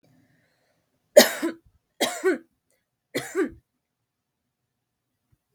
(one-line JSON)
{"three_cough_length": "5.5 s", "three_cough_amplitude": 32768, "three_cough_signal_mean_std_ratio": 0.23, "survey_phase": "beta (2021-08-13 to 2022-03-07)", "age": "18-44", "gender": "Female", "wearing_mask": "No", "symptom_runny_or_blocked_nose": true, "symptom_fatigue": true, "symptom_onset": "10 days", "smoker_status": "Never smoked", "respiratory_condition_asthma": false, "respiratory_condition_other": false, "recruitment_source": "REACT", "submission_delay": "1 day", "covid_test_result": "Negative", "covid_test_method": "RT-qPCR"}